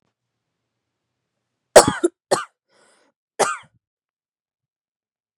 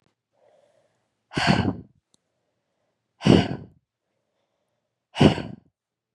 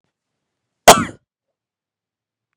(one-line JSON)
{"three_cough_length": "5.4 s", "three_cough_amplitude": 32768, "three_cough_signal_mean_std_ratio": 0.18, "exhalation_length": "6.1 s", "exhalation_amplitude": 28517, "exhalation_signal_mean_std_ratio": 0.26, "cough_length": "2.6 s", "cough_amplitude": 32768, "cough_signal_mean_std_ratio": 0.17, "survey_phase": "beta (2021-08-13 to 2022-03-07)", "age": "18-44", "gender": "Female", "wearing_mask": "No", "symptom_cough_any": true, "symptom_new_continuous_cough": true, "symptom_runny_or_blocked_nose": true, "symptom_shortness_of_breath": true, "symptom_sore_throat": true, "symptom_diarrhoea": true, "symptom_fatigue": true, "symptom_headache": true, "symptom_change_to_sense_of_smell_or_taste": true, "symptom_onset": "5 days", "smoker_status": "Current smoker (1 to 10 cigarettes per day)", "respiratory_condition_asthma": false, "respiratory_condition_other": false, "recruitment_source": "Test and Trace", "submission_delay": "2 days", "covid_test_result": "Positive", "covid_test_method": "RT-qPCR", "covid_ct_value": 16.0, "covid_ct_gene": "ORF1ab gene", "covid_ct_mean": 16.3, "covid_viral_load": "4600000 copies/ml", "covid_viral_load_category": "High viral load (>1M copies/ml)"}